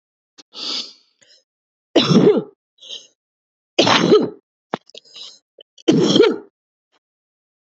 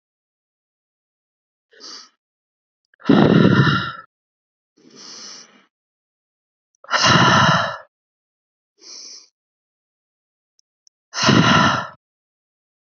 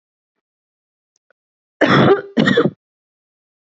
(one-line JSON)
{"three_cough_length": "7.8 s", "three_cough_amplitude": 28411, "three_cough_signal_mean_std_ratio": 0.37, "exhalation_length": "13.0 s", "exhalation_amplitude": 28718, "exhalation_signal_mean_std_ratio": 0.35, "cough_length": "3.8 s", "cough_amplitude": 26969, "cough_signal_mean_std_ratio": 0.35, "survey_phase": "alpha (2021-03-01 to 2021-08-12)", "age": "18-44", "gender": "Female", "wearing_mask": "No", "symptom_none": true, "smoker_status": "Never smoked", "respiratory_condition_asthma": false, "respiratory_condition_other": false, "recruitment_source": "REACT", "submission_delay": "2 days", "covid_test_result": "Negative", "covid_test_method": "RT-qPCR"}